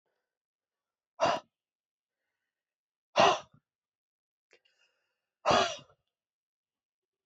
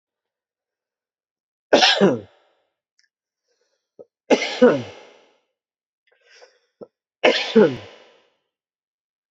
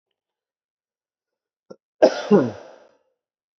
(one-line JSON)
{"exhalation_length": "7.3 s", "exhalation_amplitude": 10488, "exhalation_signal_mean_std_ratio": 0.23, "three_cough_length": "9.3 s", "three_cough_amplitude": 27994, "three_cough_signal_mean_std_ratio": 0.28, "cough_length": "3.6 s", "cough_amplitude": 27734, "cough_signal_mean_std_ratio": 0.23, "survey_phase": "beta (2021-08-13 to 2022-03-07)", "age": "45-64", "gender": "Male", "wearing_mask": "No", "symptom_cough_any": true, "symptom_runny_or_blocked_nose": true, "symptom_diarrhoea": true, "symptom_onset": "3 days", "smoker_status": "Ex-smoker", "respiratory_condition_asthma": false, "respiratory_condition_other": false, "recruitment_source": "Test and Trace", "submission_delay": "2 days", "covid_test_result": "Positive", "covid_test_method": "RT-qPCR"}